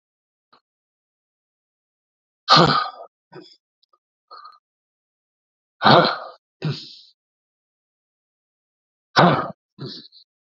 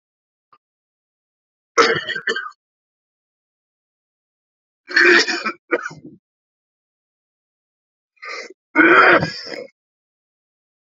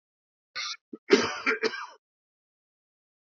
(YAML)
exhalation_length: 10.5 s
exhalation_amplitude: 32768
exhalation_signal_mean_std_ratio: 0.25
three_cough_length: 10.8 s
three_cough_amplitude: 31968
three_cough_signal_mean_std_ratio: 0.3
cough_length: 3.3 s
cough_amplitude: 18865
cough_signal_mean_std_ratio: 0.31
survey_phase: beta (2021-08-13 to 2022-03-07)
age: 45-64
gender: Male
wearing_mask: 'No'
symptom_cough_any: true
symptom_fatigue: true
symptom_onset: 5 days
smoker_status: Never smoked
respiratory_condition_asthma: false
respiratory_condition_other: false
recruitment_source: Test and Trace
submission_delay: 1 day
covid_test_result: Positive
covid_test_method: RT-qPCR
covid_ct_value: 17.6
covid_ct_gene: ORF1ab gene
covid_ct_mean: 18.0
covid_viral_load: 1200000 copies/ml
covid_viral_load_category: High viral load (>1M copies/ml)